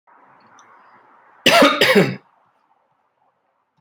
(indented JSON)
{
  "cough_length": "3.8 s",
  "cough_amplitude": 32768,
  "cough_signal_mean_std_ratio": 0.33,
  "survey_phase": "beta (2021-08-13 to 2022-03-07)",
  "age": "18-44",
  "gender": "Male",
  "wearing_mask": "No",
  "symptom_sore_throat": true,
  "symptom_fatigue": true,
  "symptom_headache": true,
  "smoker_status": "Current smoker (e-cigarettes or vapes only)",
  "respiratory_condition_asthma": false,
  "respiratory_condition_other": false,
  "recruitment_source": "REACT",
  "submission_delay": "2 days",
  "covid_test_result": "Negative",
  "covid_test_method": "RT-qPCR"
}